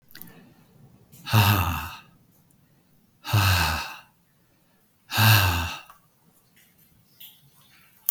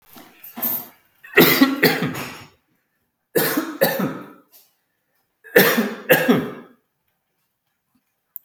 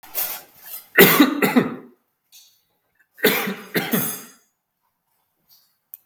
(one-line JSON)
{"exhalation_length": "8.1 s", "exhalation_amplitude": 29743, "exhalation_signal_mean_std_ratio": 0.39, "three_cough_length": "8.4 s", "three_cough_amplitude": 32768, "three_cough_signal_mean_std_ratio": 0.41, "cough_length": "6.1 s", "cough_amplitude": 32768, "cough_signal_mean_std_ratio": 0.37, "survey_phase": "beta (2021-08-13 to 2022-03-07)", "age": "65+", "gender": "Male", "wearing_mask": "No", "symptom_none": true, "smoker_status": "Never smoked", "respiratory_condition_asthma": false, "respiratory_condition_other": false, "recruitment_source": "REACT", "submission_delay": "4 days", "covid_test_result": "Negative", "covid_test_method": "RT-qPCR"}